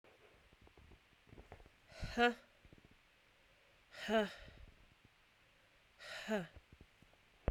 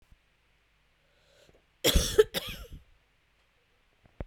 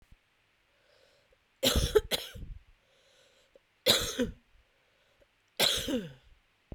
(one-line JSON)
{"exhalation_length": "7.5 s", "exhalation_amplitude": 3114, "exhalation_signal_mean_std_ratio": 0.31, "cough_length": "4.3 s", "cough_amplitude": 14982, "cough_signal_mean_std_ratio": 0.25, "three_cough_length": "6.7 s", "three_cough_amplitude": 12922, "three_cough_signal_mean_std_ratio": 0.35, "survey_phase": "beta (2021-08-13 to 2022-03-07)", "age": "18-44", "gender": "Female", "wearing_mask": "No", "symptom_cough_any": true, "symptom_new_continuous_cough": true, "symptom_runny_or_blocked_nose": true, "symptom_sore_throat": true, "symptom_fatigue": true, "symptom_fever_high_temperature": true, "symptom_headache": true, "symptom_other": true, "symptom_onset": "3 days", "smoker_status": "Never smoked", "respiratory_condition_asthma": false, "respiratory_condition_other": false, "recruitment_source": "Test and Trace", "submission_delay": "2 days", "covid_test_result": "Positive", "covid_test_method": "RT-qPCR", "covid_ct_value": 16.7, "covid_ct_gene": "ORF1ab gene", "covid_ct_mean": 18.1, "covid_viral_load": "1200000 copies/ml", "covid_viral_load_category": "High viral load (>1M copies/ml)"}